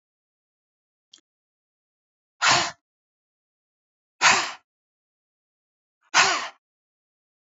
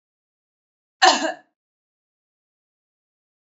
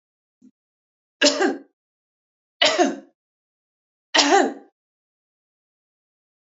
{"exhalation_length": "7.5 s", "exhalation_amplitude": 24298, "exhalation_signal_mean_std_ratio": 0.25, "cough_length": "3.4 s", "cough_amplitude": 29331, "cough_signal_mean_std_ratio": 0.2, "three_cough_length": "6.5 s", "three_cough_amplitude": 27879, "three_cough_signal_mean_std_ratio": 0.31, "survey_phase": "beta (2021-08-13 to 2022-03-07)", "age": "65+", "gender": "Female", "wearing_mask": "No", "symptom_none": true, "smoker_status": "Ex-smoker", "respiratory_condition_asthma": false, "respiratory_condition_other": false, "recruitment_source": "REACT", "submission_delay": "1 day", "covid_test_result": "Negative", "covid_test_method": "RT-qPCR", "influenza_a_test_result": "Negative", "influenza_b_test_result": "Negative"}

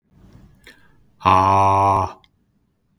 {"exhalation_length": "3.0 s", "exhalation_amplitude": 31358, "exhalation_signal_mean_std_ratio": 0.45, "survey_phase": "beta (2021-08-13 to 2022-03-07)", "age": "45-64", "gender": "Male", "wearing_mask": "No", "symptom_none": true, "smoker_status": "Never smoked", "respiratory_condition_asthma": false, "respiratory_condition_other": false, "recruitment_source": "REACT", "submission_delay": "1 day", "covid_test_result": "Negative", "covid_test_method": "RT-qPCR", "influenza_a_test_result": "Negative", "influenza_b_test_result": "Negative"}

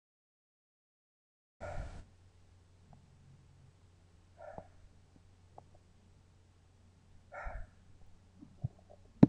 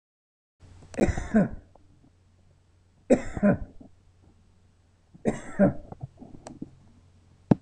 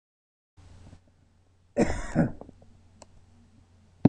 {"exhalation_length": "9.3 s", "exhalation_amplitude": 17726, "exhalation_signal_mean_std_ratio": 0.15, "three_cough_length": "7.6 s", "three_cough_amplitude": 22245, "three_cough_signal_mean_std_ratio": 0.32, "cough_length": "4.1 s", "cough_amplitude": 22830, "cough_signal_mean_std_ratio": 0.27, "survey_phase": "beta (2021-08-13 to 2022-03-07)", "age": "65+", "gender": "Male", "wearing_mask": "No", "symptom_none": true, "smoker_status": "Ex-smoker", "respiratory_condition_asthma": false, "respiratory_condition_other": false, "recruitment_source": "REACT", "submission_delay": "10 days", "covid_test_result": "Negative", "covid_test_method": "RT-qPCR"}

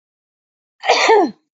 {"cough_length": "1.5 s", "cough_amplitude": 28501, "cough_signal_mean_std_ratio": 0.45, "survey_phase": "beta (2021-08-13 to 2022-03-07)", "age": "18-44", "gender": "Female", "wearing_mask": "No", "symptom_cough_any": true, "symptom_new_continuous_cough": true, "symptom_sore_throat": true, "symptom_other": true, "symptom_onset": "3 days", "smoker_status": "Ex-smoker", "respiratory_condition_asthma": false, "respiratory_condition_other": false, "recruitment_source": "Test and Trace", "submission_delay": "1 day", "covid_test_result": "Negative", "covid_test_method": "RT-qPCR"}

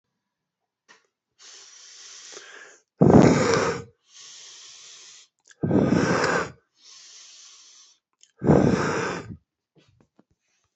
{"exhalation_length": "10.8 s", "exhalation_amplitude": 27110, "exhalation_signal_mean_std_ratio": 0.37, "survey_phase": "beta (2021-08-13 to 2022-03-07)", "age": "45-64", "gender": "Male", "wearing_mask": "Yes", "symptom_new_continuous_cough": true, "symptom_abdominal_pain": true, "symptom_diarrhoea": true, "symptom_fatigue": true, "symptom_change_to_sense_of_smell_or_taste": true, "symptom_loss_of_taste": true, "symptom_onset": "6 days", "smoker_status": "Current smoker (1 to 10 cigarettes per day)", "respiratory_condition_asthma": false, "respiratory_condition_other": false, "recruitment_source": "Test and Trace", "submission_delay": "2 days", "covid_test_result": "Positive", "covid_test_method": "RT-qPCR", "covid_ct_value": 18.4, "covid_ct_gene": "N gene", "covid_ct_mean": 18.7, "covid_viral_load": "710000 copies/ml", "covid_viral_load_category": "Low viral load (10K-1M copies/ml)"}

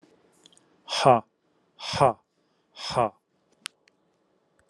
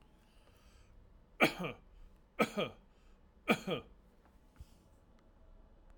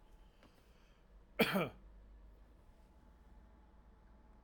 {"exhalation_length": "4.7 s", "exhalation_amplitude": 21335, "exhalation_signal_mean_std_ratio": 0.26, "three_cough_length": "6.0 s", "three_cough_amplitude": 7133, "three_cough_signal_mean_std_ratio": 0.3, "cough_length": "4.4 s", "cough_amplitude": 5095, "cough_signal_mean_std_ratio": 0.31, "survey_phase": "alpha (2021-03-01 to 2021-08-12)", "age": "45-64", "gender": "Male", "wearing_mask": "No", "symptom_none": true, "smoker_status": "Never smoked", "respiratory_condition_asthma": false, "respiratory_condition_other": false, "recruitment_source": "REACT", "submission_delay": "1 day", "covid_test_result": "Negative", "covid_test_method": "RT-qPCR"}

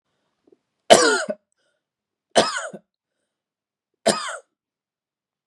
{"three_cough_length": "5.5 s", "three_cough_amplitude": 32768, "three_cough_signal_mean_std_ratio": 0.26, "survey_phase": "beta (2021-08-13 to 2022-03-07)", "age": "18-44", "gender": "Male", "wearing_mask": "No", "symptom_cough_any": true, "symptom_sore_throat": true, "symptom_onset": "4 days", "smoker_status": "Never smoked", "respiratory_condition_asthma": false, "respiratory_condition_other": false, "recruitment_source": "Test and Trace", "submission_delay": "1 day", "covid_test_result": "Positive", "covid_test_method": "RT-qPCR", "covid_ct_value": 20.8, "covid_ct_gene": "N gene"}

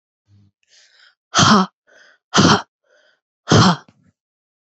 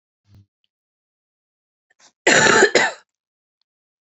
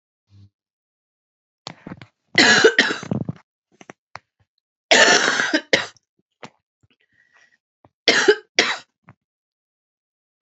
{"exhalation_length": "4.7 s", "exhalation_amplitude": 31261, "exhalation_signal_mean_std_ratio": 0.35, "cough_length": "4.0 s", "cough_amplitude": 32767, "cough_signal_mean_std_ratio": 0.31, "three_cough_length": "10.4 s", "three_cough_amplitude": 32768, "three_cough_signal_mean_std_ratio": 0.32, "survey_phase": "beta (2021-08-13 to 2022-03-07)", "age": "18-44", "gender": "Female", "wearing_mask": "No", "symptom_cough_any": true, "symptom_runny_or_blocked_nose": true, "symptom_sore_throat": true, "symptom_onset": "3 days", "smoker_status": "Ex-smoker", "respiratory_condition_asthma": false, "respiratory_condition_other": false, "recruitment_source": "REACT", "submission_delay": "1 day", "covid_test_result": "Negative", "covid_test_method": "RT-qPCR"}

